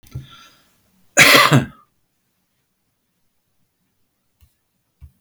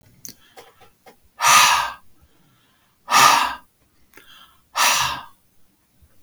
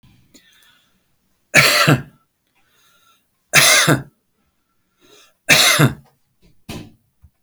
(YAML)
cough_length: 5.2 s
cough_amplitude: 32768
cough_signal_mean_std_ratio: 0.25
exhalation_length: 6.2 s
exhalation_amplitude: 32327
exhalation_signal_mean_std_ratio: 0.38
three_cough_length: 7.4 s
three_cough_amplitude: 32768
three_cough_signal_mean_std_ratio: 0.35
survey_phase: beta (2021-08-13 to 2022-03-07)
age: 65+
gender: Male
wearing_mask: 'No'
symptom_none: true
smoker_status: Never smoked
respiratory_condition_asthma: false
respiratory_condition_other: false
recruitment_source: REACT
submission_delay: 4 days
covid_test_result: Negative
covid_test_method: RT-qPCR
influenza_a_test_result: Negative
influenza_b_test_result: Negative